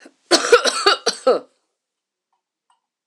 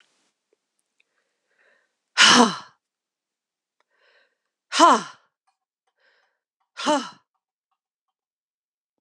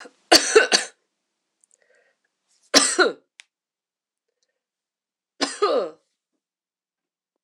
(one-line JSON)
{"cough_length": "3.1 s", "cough_amplitude": 26028, "cough_signal_mean_std_ratio": 0.36, "exhalation_length": "9.0 s", "exhalation_amplitude": 26027, "exhalation_signal_mean_std_ratio": 0.23, "three_cough_length": "7.4 s", "three_cough_amplitude": 26028, "three_cough_signal_mean_std_ratio": 0.27, "survey_phase": "alpha (2021-03-01 to 2021-08-12)", "age": "45-64", "gender": "Female", "wearing_mask": "No", "symptom_fatigue": true, "symptom_fever_high_temperature": true, "symptom_headache": true, "symptom_change_to_sense_of_smell_or_taste": true, "symptom_loss_of_taste": true, "symptom_onset": "6 days", "smoker_status": "Never smoked", "respiratory_condition_asthma": false, "respiratory_condition_other": false, "recruitment_source": "Test and Trace", "submission_delay": "2 days", "covid_test_result": "Positive", "covid_test_method": "RT-qPCR", "covid_ct_value": 16.6, "covid_ct_gene": "ORF1ab gene", "covid_ct_mean": 18.1, "covid_viral_load": "1100000 copies/ml", "covid_viral_load_category": "High viral load (>1M copies/ml)"}